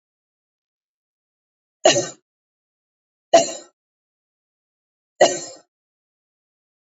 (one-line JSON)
{"three_cough_length": "7.0 s", "three_cough_amplitude": 28260, "three_cough_signal_mean_std_ratio": 0.2, "survey_phase": "beta (2021-08-13 to 2022-03-07)", "age": "18-44", "gender": "Female", "wearing_mask": "No", "symptom_none": true, "smoker_status": "Never smoked", "respiratory_condition_asthma": false, "respiratory_condition_other": false, "recruitment_source": "REACT", "submission_delay": "1 day", "covid_test_result": "Negative", "covid_test_method": "RT-qPCR", "influenza_a_test_result": "Negative", "influenza_b_test_result": "Negative"}